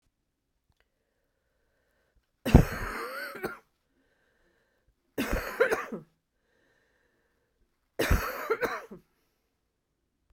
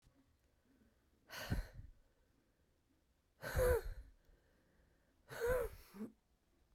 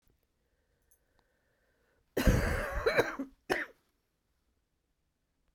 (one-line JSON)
{"three_cough_length": "10.3 s", "three_cough_amplitude": 28109, "three_cough_signal_mean_std_ratio": 0.27, "exhalation_length": "6.7 s", "exhalation_amplitude": 2357, "exhalation_signal_mean_std_ratio": 0.36, "cough_length": "5.5 s", "cough_amplitude": 8332, "cough_signal_mean_std_ratio": 0.33, "survey_phase": "beta (2021-08-13 to 2022-03-07)", "age": "45-64", "gender": "Female", "wearing_mask": "No", "symptom_cough_any": true, "symptom_runny_or_blocked_nose": true, "symptom_fatigue": true, "symptom_fever_high_temperature": true, "symptom_headache": true, "symptom_change_to_sense_of_smell_or_taste": true, "symptom_onset": "8 days", "smoker_status": "Never smoked", "respiratory_condition_asthma": false, "respiratory_condition_other": false, "recruitment_source": "Test and Trace", "submission_delay": "2 days", "covid_test_result": "Positive", "covid_test_method": "RT-qPCR", "covid_ct_value": 20.5, "covid_ct_gene": "ORF1ab gene", "covid_ct_mean": 20.8, "covid_viral_load": "150000 copies/ml", "covid_viral_load_category": "Low viral load (10K-1M copies/ml)"}